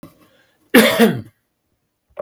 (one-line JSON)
{"cough_length": "2.2 s", "cough_amplitude": 32768, "cough_signal_mean_std_ratio": 0.35, "survey_phase": "beta (2021-08-13 to 2022-03-07)", "age": "65+", "gender": "Male", "wearing_mask": "No", "symptom_none": true, "smoker_status": "Ex-smoker", "respiratory_condition_asthma": false, "respiratory_condition_other": false, "recruitment_source": "REACT", "submission_delay": "2 days", "covid_test_result": "Negative", "covid_test_method": "RT-qPCR", "influenza_a_test_result": "Negative", "influenza_b_test_result": "Negative"}